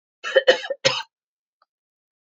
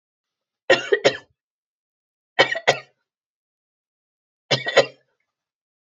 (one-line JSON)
{"cough_length": "2.4 s", "cough_amplitude": 27658, "cough_signal_mean_std_ratio": 0.29, "three_cough_length": "5.8 s", "three_cough_amplitude": 32767, "three_cough_signal_mean_std_ratio": 0.26, "survey_phase": "beta (2021-08-13 to 2022-03-07)", "age": "45-64", "gender": "Female", "wearing_mask": "No", "symptom_none": true, "symptom_onset": "6 days", "smoker_status": "Never smoked", "respiratory_condition_asthma": true, "respiratory_condition_other": false, "recruitment_source": "REACT", "submission_delay": "1 day", "covid_test_result": "Negative", "covid_test_method": "RT-qPCR", "influenza_a_test_result": "Unknown/Void", "influenza_b_test_result": "Unknown/Void"}